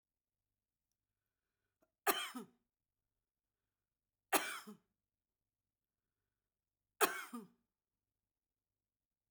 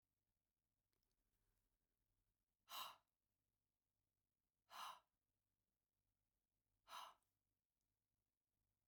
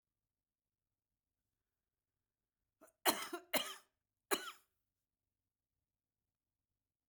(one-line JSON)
{"three_cough_length": "9.3 s", "three_cough_amplitude": 4963, "three_cough_signal_mean_std_ratio": 0.19, "exhalation_length": "8.9 s", "exhalation_amplitude": 288, "exhalation_signal_mean_std_ratio": 0.24, "cough_length": "7.1 s", "cough_amplitude": 5219, "cough_signal_mean_std_ratio": 0.19, "survey_phase": "beta (2021-08-13 to 2022-03-07)", "age": "65+", "gender": "Female", "wearing_mask": "No", "symptom_none": true, "smoker_status": "Current smoker (1 to 10 cigarettes per day)", "respiratory_condition_asthma": true, "respiratory_condition_other": false, "recruitment_source": "REACT", "submission_delay": "2 days", "covid_test_result": "Negative", "covid_test_method": "RT-qPCR"}